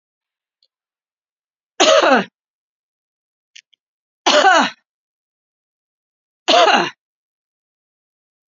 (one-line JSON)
{"three_cough_length": "8.5 s", "three_cough_amplitude": 31033, "three_cough_signal_mean_std_ratio": 0.31, "survey_phase": "beta (2021-08-13 to 2022-03-07)", "age": "45-64", "gender": "Female", "wearing_mask": "No", "symptom_runny_or_blocked_nose": true, "symptom_fatigue": true, "symptom_onset": "4 days", "smoker_status": "Never smoked", "respiratory_condition_asthma": false, "respiratory_condition_other": false, "recruitment_source": "Test and Trace", "submission_delay": "2 days", "covid_test_result": "Positive", "covid_test_method": "RT-qPCR"}